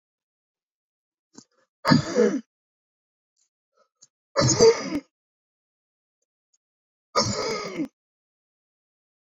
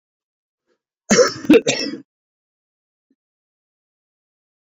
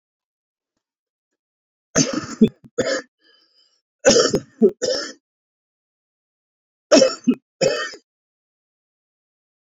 {"exhalation_length": "9.3 s", "exhalation_amplitude": 22311, "exhalation_signal_mean_std_ratio": 0.3, "cough_length": "4.8 s", "cough_amplitude": 28136, "cough_signal_mean_std_ratio": 0.25, "three_cough_length": "9.7 s", "three_cough_amplitude": 30415, "three_cough_signal_mean_std_ratio": 0.31, "survey_phase": "beta (2021-08-13 to 2022-03-07)", "age": "65+", "gender": "Male", "wearing_mask": "No", "symptom_cough_any": true, "symptom_runny_or_blocked_nose": true, "symptom_sore_throat": true, "symptom_fatigue": true, "symptom_headache": true, "symptom_onset": "4 days", "smoker_status": "Ex-smoker", "respiratory_condition_asthma": false, "respiratory_condition_other": false, "recruitment_source": "Test and Trace", "submission_delay": "2 days", "covid_test_result": "Positive", "covid_test_method": "RT-qPCR", "covid_ct_value": 17.3, "covid_ct_gene": "ORF1ab gene", "covid_ct_mean": 17.9, "covid_viral_load": "1300000 copies/ml", "covid_viral_load_category": "High viral load (>1M copies/ml)"}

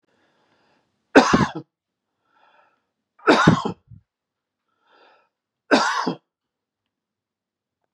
{"three_cough_length": "7.9 s", "three_cough_amplitude": 32768, "three_cough_signal_mean_std_ratio": 0.27, "survey_phase": "beta (2021-08-13 to 2022-03-07)", "age": "45-64", "gender": "Male", "wearing_mask": "No", "symptom_none": true, "smoker_status": "Never smoked", "respiratory_condition_asthma": false, "respiratory_condition_other": false, "recruitment_source": "REACT", "submission_delay": "2 days", "covid_test_result": "Negative", "covid_test_method": "RT-qPCR", "influenza_a_test_result": "Negative", "influenza_b_test_result": "Negative"}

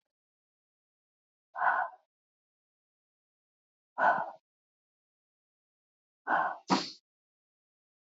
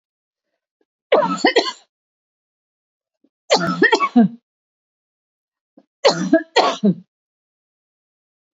{"exhalation_length": "8.2 s", "exhalation_amplitude": 7175, "exhalation_signal_mean_std_ratio": 0.27, "three_cough_length": "8.5 s", "three_cough_amplitude": 30687, "three_cough_signal_mean_std_ratio": 0.34, "survey_phase": "beta (2021-08-13 to 2022-03-07)", "age": "45-64", "gender": "Female", "wearing_mask": "No", "symptom_cough_any": true, "symptom_onset": "6 days", "smoker_status": "Ex-smoker", "respiratory_condition_asthma": false, "respiratory_condition_other": false, "recruitment_source": "REACT", "submission_delay": "1 day", "covid_test_result": "Negative", "covid_test_method": "RT-qPCR"}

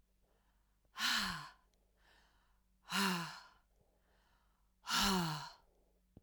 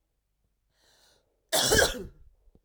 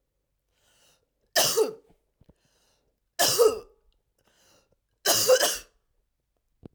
{"exhalation_length": "6.2 s", "exhalation_amplitude": 3155, "exhalation_signal_mean_std_ratio": 0.41, "cough_length": "2.6 s", "cough_amplitude": 11753, "cough_signal_mean_std_ratio": 0.34, "three_cough_length": "6.7 s", "three_cough_amplitude": 14662, "three_cough_signal_mean_std_ratio": 0.34, "survey_phase": "beta (2021-08-13 to 2022-03-07)", "age": "45-64", "gender": "Female", "wearing_mask": "No", "symptom_cough_any": true, "symptom_fatigue": true, "symptom_onset": "3 days", "smoker_status": "Never smoked", "respiratory_condition_asthma": false, "respiratory_condition_other": false, "recruitment_source": "Test and Trace", "submission_delay": "2 days", "covid_test_result": "Positive", "covid_test_method": "LAMP"}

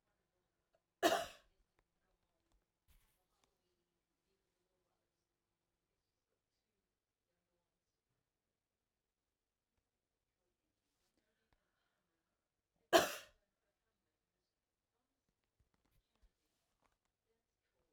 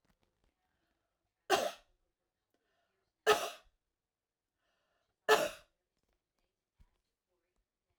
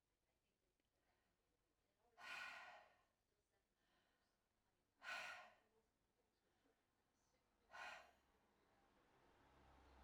{"cough_length": "17.9 s", "cough_amplitude": 6239, "cough_signal_mean_std_ratio": 0.11, "three_cough_length": "8.0 s", "three_cough_amplitude": 6929, "three_cough_signal_mean_std_ratio": 0.2, "exhalation_length": "10.0 s", "exhalation_amplitude": 280, "exhalation_signal_mean_std_ratio": 0.37, "survey_phase": "alpha (2021-03-01 to 2021-08-12)", "age": "65+", "gender": "Female", "wearing_mask": "No", "symptom_none": true, "smoker_status": "Ex-smoker", "respiratory_condition_asthma": false, "respiratory_condition_other": false, "recruitment_source": "REACT", "submission_delay": "1 day", "covid_test_result": "Negative", "covid_test_method": "RT-qPCR"}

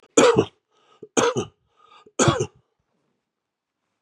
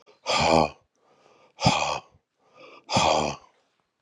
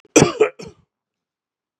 {"three_cough_length": "4.0 s", "three_cough_amplitude": 27585, "three_cough_signal_mean_std_ratio": 0.34, "exhalation_length": "4.0 s", "exhalation_amplitude": 18342, "exhalation_signal_mean_std_ratio": 0.44, "cough_length": "1.8 s", "cough_amplitude": 32768, "cough_signal_mean_std_ratio": 0.28, "survey_phase": "beta (2021-08-13 to 2022-03-07)", "age": "65+", "gender": "Male", "wearing_mask": "No", "symptom_cough_any": true, "symptom_runny_or_blocked_nose": true, "symptom_shortness_of_breath": true, "symptom_fatigue": true, "symptom_fever_high_temperature": true, "symptom_headache": true, "symptom_change_to_sense_of_smell_or_taste": true, "symptom_loss_of_taste": true, "symptom_onset": "4 days", "smoker_status": "Never smoked", "respiratory_condition_asthma": false, "respiratory_condition_other": false, "recruitment_source": "Test and Trace", "submission_delay": "1 day", "covid_test_result": "Positive", "covid_test_method": "ePCR"}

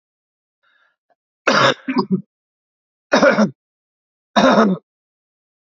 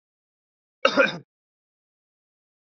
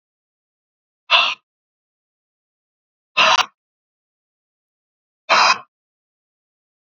{"three_cough_length": "5.7 s", "three_cough_amplitude": 32767, "three_cough_signal_mean_std_ratio": 0.38, "cough_length": "2.7 s", "cough_amplitude": 28633, "cough_signal_mean_std_ratio": 0.22, "exhalation_length": "6.8 s", "exhalation_amplitude": 30999, "exhalation_signal_mean_std_ratio": 0.26, "survey_phase": "beta (2021-08-13 to 2022-03-07)", "age": "45-64", "gender": "Male", "wearing_mask": "No", "symptom_cough_any": true, "symptom_runny_or_blocked_nose": true, "symptom_sore_throat": true, "symptom_fatigue": true, "symptom_change_to_sense_of_smell_or_taste": true, "symptom_other": true, "symptom_onset": "3 days", "smoker_status": "Never smoked", "respiratory_condition_asthma": false, "respiratory_condition_other": false, "recruitment_source": "Test and Trace", "submission_delay": "2 days", "covid_test_result": "Positive", "covid_test_method": "RT-qPCR"}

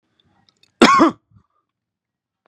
{"cough_length": "2.5 s", "cough_amplitude": 32768, "cough_signal_mean_std_ratio": 0.28, "survey_phase": "beta (2021-08-13 to 2022-03-07)", "age": "18-44", "gender": "Male", "wearing_mask": "No", "symptom_fatigue": true, "symptom_headache": true, "smoker_status": "Ex-smoker", "respiratory_condition_asthma": false, "respiratory_condition_other": false, "recruitment_source": "Test and Trace", "submission_delay": "1 day", "covid_test_result": "Positive", "covid_test_method": "RT-qPCR"}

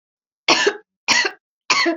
{"three_cough_length": "2.0 s", "three_cough_amplitude": 29262, "three_cough_signal_mean_std_ratio": 0.5, "survey_phase": "alpha (2021-03-01 to 2021-08-12)", "age": "45-64", "gender": "Female", "wearing_mask": "No", "symptom_none": true, "smoker_status": "Ex-smoker", "respiratory_condition_asthma": false, "respiratory_condition_other": false, "recruitment_source": "REACT", "submission_delay": "1 day", "covid_test_result": "Negative", "covid_test_method": "RT-qPCR"}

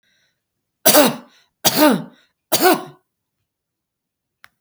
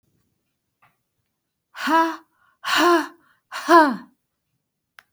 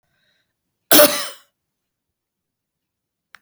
{"three_cough_length": "4.6 s", "three_cough_amplitude": 32768, "three_cough_signal_mean_std_ratio": 0.34, "exhalation_length": "5.1 s", "exhalation_amplitude": 27578, "exhalation_signal_mean_std_ratio": 0.35, "cough_length": "3.4 s", "cough_amplitude": 32768, "cough_signal_mean_std_ratio": 0.22, "survey_phase": "beta (2021-08-13 to 2022-03-07)", "age": "65+", "gender": "Female", "wearing_mask": "No", "symptom_none": true, "smoker_status": "Never smoked", "respiratory_condition_asthma": false, "respiratory_condition_other": false, "recruitment_source": "REACT", "submission_delay": "3 days", "covid_test_result": "Negative", "covid_test_method": "RT-qPCR"}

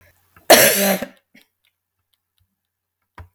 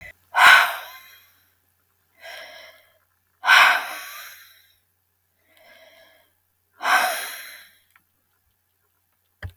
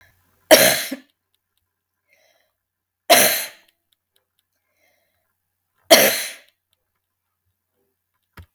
{"cough_length": "3.3 s", "cough_amplitude": 32768, "cough_signal_mean_std_ratio": 0.29, "exhalation_length": "9.6 s", "exhalation_amplitude": 32768, "exhalation_signal_mean_std_ratio": 0.29, "three_cough_length": "8.5 s", "three_cough_amplitude": 32768, "three_cough_signal_mean_std_ratio": 0.25, "survey_phase": "beta (2021-08-13 to 2022-03-07)", "age": "65+", "gender": "Female", "wearing_mask": "No", "symptom_none": true, "smoker_status": "Never smoked", "respiratory_condition_asthma": false, "respiratory_condition_other": false, "recruitment_source": "REACT", "submission_delay": "1 day", "covid_test_result": "Negative", "covid_test_method": "RT-qPCR", "influenza_a_test_result": "Negative", "influenza_b_test_result": "Negative"}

